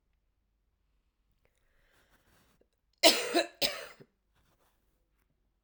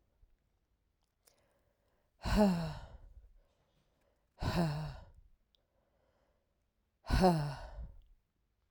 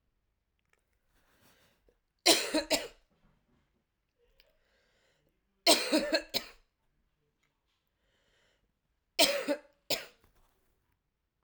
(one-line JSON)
{"cough_length": "5.6 s", "cough_amplitude": 17443, "cough_signal_mean_std_ratio": 0.21, "exhalation_length": "8.7 s", "exhalation_amplitude": 4921, "exhalation_signal_mean_std_ratio": 0.35, "three_cough_length": "11.4 s", "three_cough_amplitude": 12428, "three_cough_signal_mean_std_ratio": 0.26, "survey_phase": "alpha (2021-03-01 to 2021-08-12)", "age": "45-64", "gender": "Female", "wearing_mask": "No", "symptom_cough_any": true, "symptom_new_continuous_cough": true, "symptom_abdominal_pain": true, "symptom_fatigue": true, "symptom_headache": true, "symptom_onset": "3 days", "smoker_status": "Never smoked", "respiratory_condition_asthma": false, "respiratory_condition_other": false, "recruitment_source": "Test and Trace", "submission_delay": "1 day", "covid_test_result": "Positive", "covid_test_method": "RT-qPCR"}